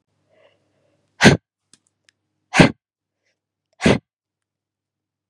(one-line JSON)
{"exhalation_length": "5.3 s", "exhalation_amplitude": 32768, "exhalation_signal_mean_std_ratio": 0.21, "survey_phase": "beta (2021-08-13 to 2022-03-07)", "age": "18-44", "gender": "Female", "wearing_mask": "No", "symptom_runny_or_blocked_nose": true, "symptom_fatigue": true, "symptom_headache": true, "smoker_status": "Never smoked", "respiratory_condition_asthma": false, "respiratory_condition_other": false, "recruitment_source": "Test and Trace", "submission_delay": "2 days", "covid_test_result": "Positive", "covid_test_method": "RT-qPCR"}